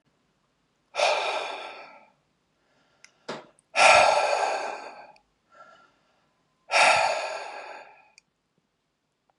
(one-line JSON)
{"exhalation_length": "9.4 s", "exhalation_amplitude": 19805, "exhalation_signal_mean_std_ratio": 0.38, "survey_phase": "beta (2021-08-13 to 2022-03-07)", "age": "18-44", "gender": "Male", "wearing_mask": "No", "symptom_none": true, "smoker_status": "Never smoked", "respiratory_condition_asthma": false, "respiratory_condition_other": false, "recruitment_source": "REACT", "submission_delay": "1 day", "covid_test_result": "Negative", "covid_test_method": "RT-qPCR", "influenza_a_test_result": "Negative", "influenza_b_test_result": "Negative"}